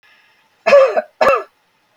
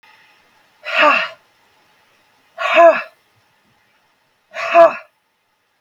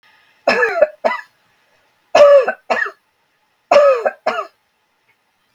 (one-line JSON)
{"cough_length": "2.0 s", "cough_amplitude": 32766, "cough_signal_mean_std_ratio": 0.43, "exhalation_length": "5.8 s", "exhalation_amplitude": 32768, "exhalation_signal_mean_std_ratio": 0.33, "three_cough_length": "5.5 s", "three_cough_amplitude": 32768, "three_cough_signal_mean_std_ratio": 0.42, "survey_phase": "beta (2021-08-13 to 2022-03-07)", "age": "45-64", "gender": "Female", "wearing_mask": "No", "symptom_none": true, "smoker_status": "Never smoked", "respiratory_condition_asthma": false, "respiratory_condition_other": false, "recruitment_source": "REACT", "submission_delay": "1 day", "covid_test_result": "Negative", "covid_test_method": "RT-qPCR", "influenza_a_test_result": "Negative", "influenza_b_test_result": "Negative"}